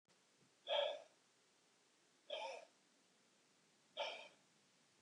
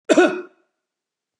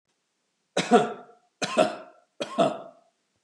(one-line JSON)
{"exhalation_length": "5.0 s", "exhalation_amplitude": 1307, "exhalation_signal_mean_std_ratio": 0.35, "cough_length": "1.4 s", "cough_amplitude": 26433, "cough_signal_mean_std_ratio": 0.34, "three_cough_length": "3.4 s", "three_cough_amplitude": 19241, "three_cough_signal_mean_std_ratio": 0.36, "survey_phase": "beta (2021-08-13 to 2022-03-07)", "age": "65+", "gender": "Male", "wearing_mask": "No", "symptom_none": true, "smoker_status": "Ex-smoker", "respiratory_condition_asthma": false, "respiratory_condition_other": false, "recruitment_source": "REACT", "submission_delay": "2 days", "covid_test_result": "Negative", "covid_test_method": "RT-qPCR", "influenza_a_test_result": "Negative", "influenza_b_test_result": "Negative"}